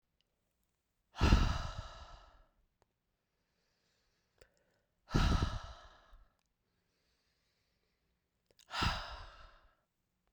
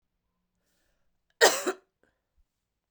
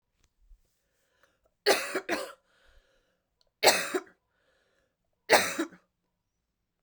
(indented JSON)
{
  "exhalation_length": "10.3 s",
  "exhalation_amplitude": 8379,
  "exhalation_signal_mean_std_ratio": 0.29,
  "cough_length": "2.9 s",
  "cough_amplitude": 17831,
  "cough_signal_mean_std_ratio": 0.2,
  "three_cough_length": "6.8 s",
  "three_cough_amplitude": 18211,
  "three_cough_signal_mean_std_ratio": 0.28,
  "survey_phase": "beta (2021-08-13 to 2022-03-07)",
  "age": "18-44",
  "gender": "Female",
  "wearing_mask": "No",
  "symptom_cough_any": true,
  "symptom_new_continuous_cough": true,
  "symptom_runny_or_blocked_nose": true,
  "symptom_shortness_of_breath": true,
  "symptom_sore_throat": true,
  "symptom_fatigue": true,
  "symptom_headache": true,
  "symptom_change_to_sense_of_smell_or_taste": true,
  "symptom_loss_of_taste": true,
  "symptom_other": true,
  "symptom_onset": "4 days",
  "smoker_status": "Never smoked",
  "respiratory_condition_asthma": false,
  "respiratory_condition_other": false,
  "recruitment_source": "Test and Trace",
  "submission_delay": "3 days",
  "covid_test_result": "Positive",
  "covid_test_method": "RT-qPCR",
  "covid_ct_value": 14.7,
  "covid_ct_gene": "ORF1ab gene",
  "covid_ct_mean": 15.0,
  "covid_viral_load": "12000000 copies/ml",
  "covid_viral_load_category": "High viral load (>1M copies/ml)"
}